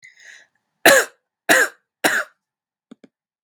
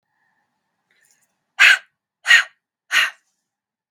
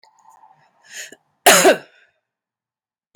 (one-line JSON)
{"three_cough_length": "3.4 s", "three_cough_amplitude": 32750, "three_cough_signal_mean_std_ratio": 0.31, "exhalation_length": "3.9 s", "exhalation_amplitude": 32768, "exhalation_signal_mean_std_ratio": 0.27, "cough_length": "3.2 s", "cough_amplitude": 32767, "cough_signal_mean_std_ratio": 0.26, "survey_phase": "beta (2021-08-13 to 2022-03-07)", "age": "45-64", "gender": "Female", "wearing_mask": "No", "symptom_cough_any": true, "symptom_runny_or_blocked_nose": true, "symptom_sore_throat": true, "symptom_fatigue": true, "symptom_headache": true, "symptom_other": true, "symptom_onset": "3 days", "smoker_status": "Ex-smoker", "respiratory_condition_asthma": false, "respiratory_condition_other": false, "recruitment_source": "Test and Trace", "submission_delay": "1 day", "covid_test_result": "Positive", "covid_test_method": "RT-qPCR", "covid_ct_value": 17.7, "covid_ct_gene": "ORF1ab gene", "covid_ct_mean": 18.2, "covid_viral_load": "1000000 copies/ml", "covid_viral_load_category": "High viral load (>1M copies/ml)"}